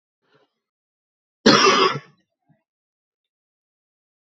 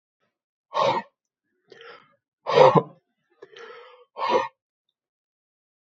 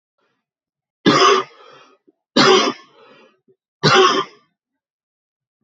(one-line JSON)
{"cough_length": "4.3 s", "cough_amplitude": 29469, "cough_signal_mean_std_ratio": 0.27, "exhalation_length": "5.8 s", "exhalation_amplitude": 26605, "exhalation_signal_mean_std_ratio": 0.28, "three_cough_length": "5.6 s", "three_cough_amplitude": 29960, "three_cough_signal_mean_std_ratio": 0.38, "survey_phase": "beta (2021-08-13 to 2022-03-07)", "age": "18-44", "gender": "Male", "wearing_mask": "No", "symptom_cough_any": true, "symptom_new_continuous_cough": true, "symptom_runny_or_blocked_nose": true, "symptom_fatigue": true, "symptom_fever_high_temperature": true, "symptom_headache": true, "symptom_other": true, "symptom_onset": "3 days", "smoker_status": "Current smoker (e-cigarettes or vapes only)", "respiratory_condition_asthma": false, "respiratory_condition_other": false, "recruitment_source": "Test and Trace", "submission_delay": "2 days", "covid_test_result": "Positive", "covid_test_method": "RT-qPCR"}